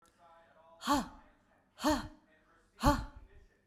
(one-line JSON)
{"exhalation_length": "3.7 s", "exhalation_amplitude": 6368, "exhalation_signal_mean_std_ratio": 0.35, "survey_phase": "beta (2021-08-13 to 2022-03-07)", "age": "45-64", "gender": "Female", "wearing_mask": "No", "symptom_none": true, "smoker_status": "Ex-smoker", "respiratory_condition_asthma": false, "respiratory_condition_other": false, "recruitment_source": "REACT", "submission_delay": "1 day", "covid_test_result": "Negative", "covid_test_method": "RT-qPCR"}